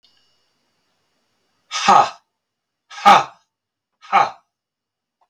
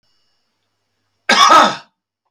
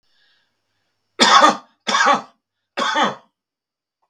{"exhalation_length": "5.3 s", "exhalation_amplitude": 32768, "exhalation_signal_mean_std_ratio": 0.27, "cough_length": "2.3 s", "cough_amplitude": 32768, "cough_signal_mean_std_ratio": 0.36, "three_cough_length": "4.1 s", "three_cough_amplitude": 32768, "three_cough_signal_mean_std_ratio": 0.38, "survey_phase": "beta (2021-08-13 to 2022-03-07)", "age": "45-64", "gender": "Male", "wearing_mask": "No", "symptom_none": true, "smoker_status": "Ex-smoker", "respiratory_condition_asthma": true, "respiratory_condition_other": false, "recruitment_source": "REACT", "submission_delay": "2 days", "covid_test_result": "Negative", "covid_test_method": "RT-qPCR", "influenza_a_test_result": "Negative", "influenza_b_test_result": "Negative"}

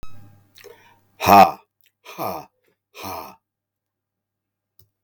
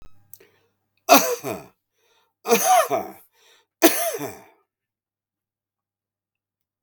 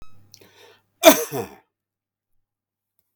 {"exhalation_length": "5.0 s", "exhalation_amplitude": 32768, "exhalation_signal_mean_std_ratio": 0.24, "three_cough_length": "6.8 s", "three_cough_amplitude": 32768, "three_cough_signal_mean_std_ratio": 0.31, "cough_length": "3.2 s", "cough_amplitude": 32768, "cough_signal_mean_std_ratio": 0.21, "survey_phase": "beta (2021-08-13 to 2022-03-07)", "age": "45-64", "gender": "Male", "wearing_mask": "No", "symptom_runny_or_blocked_nose": true, "smoker_status": "Ex-smoker", "respiratory_condition_asthma": false, "respiratory_condition_other": false, "recruitment_source": "REACT", "submission_delay": "3 days", "covid_test_result": "Negative", "covid_test_method": "RT-qPCR", "influenza_a_test_result": "Negative", "influenza_b_test_result": "Negative"}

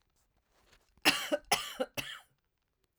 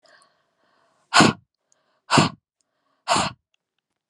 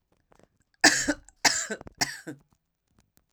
{"cough_length": "3.0 s", "cough_amplitude": 8713, "cough_signal_mean_std_ratio": 0.32, "exhalation_length": "4.1 s", "exhalation_amplitude": 30812, "exhalation_signal_mean_std_ratio": 0.28, "three_cough_length": "3.3 s", "three_cough_amplitude": 19734, "three_cough_signal_mean_std_ratio": 0.31, "survey_phase": "alpha (2021-03-01 to 2021-08-12)", "age": "45-64", "gender": "Female", "wearing_mask": "No", "symptom_fatigue": true, "symptom_change_to_sense_of_smell_or_taste": true, "smoker_status": "Never smoked", "respiratory_condition_asthma": false, "respiratory_condition_other": false, "recruitment_source": "Test and Trace", "submission_delay": "0 days", "covid_test_result": "Negative", "covid_test_method": "LFT"}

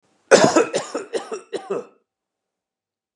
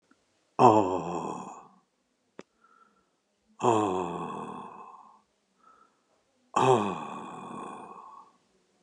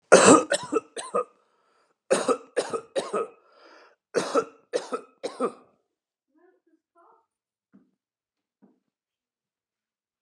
{"cough_length": "3.2 s", "cough_amplitude": 32734, "cough_signal_mean_std_ratio": 0.35, "exhalation_length": "8.8 s", "exhalation_amplitude": 18410, "exhalation_signal_mean_std_ratio": 0.36, "three_cough_length": "10.2 s", "three_cough_amplitude": 31645, "three_cough_signal_mean_std_ratio": 0.28, "survey_phase": "alpha (2021-03-01 to 2021-08-12)", "age": "65+", "gender": "Male", "wearing_mask": "No", "symptom_none": true, "smoker_status": "Never smoked", "respiratory_condition_asthma": false, "respiratory_condition_other": false, "recruitment_source": "REACT", "submission_delay": "11 days", "covid_test_result": "Negative", "covid_test_method": "RT-qPCR"}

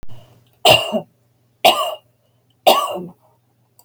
{"three_cough_length": "3.8 s", "three_cough_amplitude": 32551, "three_cough_signal_mean_std_ratio": 0.38, "survey_phase": "beta (2021-08-13 to 2022-03-07)", "age": "65+", "gender": "Female", "wearing_mask": "No", "symptom_none": true, "smoker_status": "Never smoked", "respiratory_condition_asthma": false, "respiratory_condition_other": false, "recruitment_source": "REACT", "submission_delay": "5 days", "covid_test_result": "Negative", "covid_test_method": "RT-qPCR", "influenza_a_test_result": "Negative", "influenza_b_test_result": "Negative"}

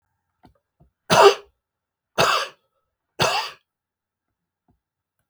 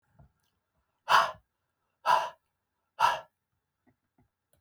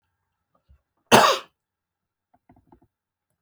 {"three_cough_length": "5.3 s", "three_cough_amplitude": 31406, "three_cough_signal_mean_std_ratio": 0.28, "exhalation_length": "4.6 s", "exhalation_amplitude": 12576, "exhalation_signal_mean_std_ratio": 0.27, "cough_length": "3.4 s", "cough_amplitude": 31780, "cough_signal_mean_std_ratio": 0.21, "survey_phase": "beta (2021-08-13 to 2022-03-07)", "age": "65+", "gender": "Male", "wearing_mask": "No", "symptom_none": true, "smoker_status": "Never smoked", "respiratory_condition_asthma": false, "respiratory_condition_other": false, "recruitment_source": "REACT", "submission_delay": "2 days", "covid_test_result": "Negative", "covid_test_method": "RT-qPCR", "influenza_a_test_result": "Unknown/Void", "influenza_b_test_result": "Unknown/Void"}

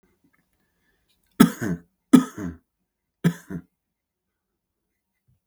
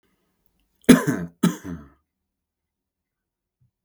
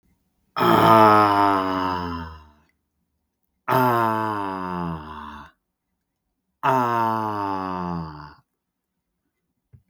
{"three_cough_length": "5.5 s", "three_cough_amplitude": 32767, "three_cough_signal_mean_std_ratio": 0.2, "cough_length": "3.8 s", "cough_amplitude": 32768, "cough_signal_mean_std_ratio": 0.22, "exhalation_length": "9.9 s", "exhalation_amplitude": 27492, "exhalation_signal_mean_std_ratio": 0.5, "survey_phase": "beta (2021-08-13 to 2022-03-07)", "age": "18-44", "gender": "Male", "wearing_mask": "No", "symptom_none": true, "smoker_status": "Never smoked", "respiratory_condition_asthma": false, "respiratory_condition_other": false, "recruitment_source": "REACT", "submission_delay": "7 days", "covid_test_result": "Negative", "covid_test_method": "RT-qPCR", "influenza_a_test_result": "Negative", "influenza_b_test_result": "Negative"}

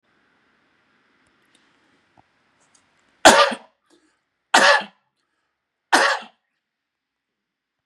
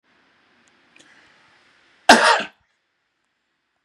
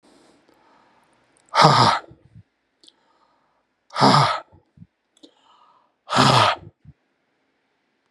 {"three_cough_length": "7.9 s", "three_cough_amplitude": 32768, "three_cough_signal_mean_std_ratio": 0.24, "cough_length": "3.8 s", "cough_amplitude": 32768, "cough_signal_mean_std_ratio": 0.22, "exhalation_length": "8.1 s", "exhalation_amplitude": 32767, "exhalation_signal_mean_std_ratio": 0.32, "survey_phase": "beta (2021-08-13 to 2022-03-07)", "age": "45-64", "gender": "Male", "wearing_mask": "No", "symptom_none": true, "smoker_status": "Ex-smoker", "respiratory_condition_asthma": false, "respiratory_condition_other": false, "recruitment_source": "REACT", "submission_delay": "1 day", "covid_test_result": "Negative", "covid_test_method": "RT-qPCR", "influenza_a_test_result": "Negative", "influenza_b_test_result": "Negative"}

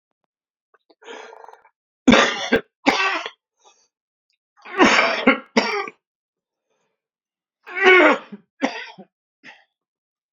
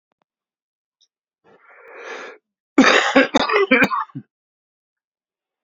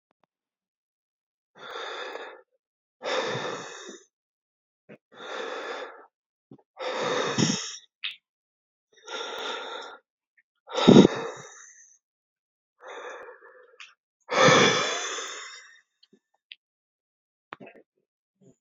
{"three_cough_length": "10.3 s", "three_cough_amplitude": 32767, "three_cough_signal_mean_std_ratio": 0.34, "cough_length": "5.6 s", "cough_amplitude": 29029, "cough_signal_mean_std_ratio": 0.35, "exhalation_length": "18.6 s", "exhalation_amplitude": 27253, "exhalation_signal_mean_std_ratio": 0.3, "survey_phase": "beta (2021-08-13 to 2022-03-07)", "age": "45-64", "gender": "Male", "wearing_mask": "No", "symptom_cough_any": true, "symptom_runny_or_blocked_nose": true, "symptom_sore_throat": true, "symptom_fatigue": true, "symptom_fever_high_temperature": true, "symptom_change_to_sense_of_smell_or_taste": true, "symptom_onset": "3 days", "smoker_status": "Ex-smoker", "respiratory_condition_asthma": true, "respiratory_condition_other": false, "recruitment_source": "Test and Trace", "submission_delay": "2 days", "covid_test_result": "Positive", "covid_test_method": "RT-qPCR", "covid_ct_value": 19.5, "covid_ct_gene": "N gene"}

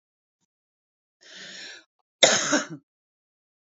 {"cough_length": "3.8 s", "cough_amplitude": 29597, "cough_signal_mean_std_ratio": 0.26, "survey_phase": "beta (2021-08-13 to 2022-03-07)", "age": "18-44", "gender": "Female", "wearing_mask": "No", "symptom_runny_or_blocked_nose": true, "symptom_headache": true, "smoker_status": "Current smoker (1 to 10 cigarettes per day)", "respiratory_condition_asthma": false, "respiratory_condition_other": false, "recruitment_source": "REACT", "submission_delay": "1 day", "covid_test_result": "Positive", "covid_test_method": "RT-qPCR", "covid_ct_value": 27.0, "covid_ct_gene": "E gene", "influenza_a_test_result": "Unknown/Void", "influenza_b_test_result": "Unknown/Void"}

